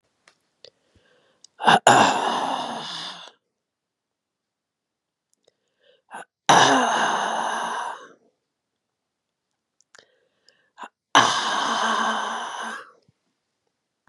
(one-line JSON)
{"exhalation_length": "14.1 s", "exhalation_amplitude": 32767, "exhalation_signal_mean_std_ratio": 0.39, "survey_phase": "beta (2021-08-13 to 2022-03-07)", "age": "45-64", "gender": "Female", "wearing_mask": "No", "symptom_cough_any": true, "symptom_runny_or_blocked_nose": true, "symptom_fatigue": true, "smoker_status": "Ex-smoker", "respiratory_condition_asthma": true, "respiratory_condition_other": false, "recruitment_source": "Test and Trace", "submission_delay": "-1 day", "covid_test_result": "Positive", "covid_test_method": "LFT"}